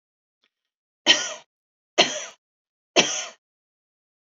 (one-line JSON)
{"three_cough_length": "4.4 s", "three_cough_amplitude": 27611, "three_cough_signal_mean_std_ratio": 0.27, "survey_phase": "beta (2021-08-13 to 2022-03-07)", "age": "45-64", "gender": "Female", "wearing_mask": "No", "symptom_none": true, "smoker_status": "Ex-smoker", "respiratory_condition_asthma": false, "respiratory_condition_other": false, "recruitment_source": "REACT", "submission_delay": "2 days", "covid_test_result": "Negative", "covid_test_method": "RT-qPCR", "influenza_a_test_result": "Negative", "influenza_b_test_result": "Negative"}